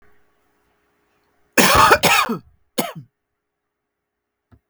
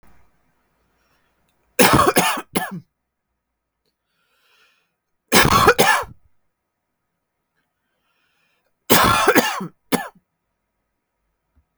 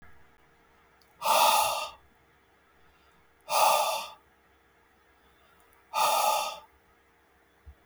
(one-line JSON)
{"cough_length": "4.7 s", "cough_amplitude": 32768, "cough_signal_mean_std_ratio": 0.33, "three_cough_length": "11.8 s", "three_cough_amplitude": 32768, "three_cough_signal_mean_std_ratio": 0.33, "exhalation_length": "7.9 s", "exhalation_amplitude": 9958, "exhalation_signal_mean_std_ratio": 0.41, "survey_phase": "beta (2021-08-13 to 2022-03-07)", "age": "45-64", "gender": "Male", "wearing_mask": "No", "symptom_none": true, "symptom_onset": "12 days", "smoker_status": "Never smoked", "respiratory_condition_asthma": false, "respiratory_condition_other": false, "recruitment_source": "REACT", "submission_delay": "13 days", "covid_test_result": "Negative", "covid_test_method": "RT-qPCR"}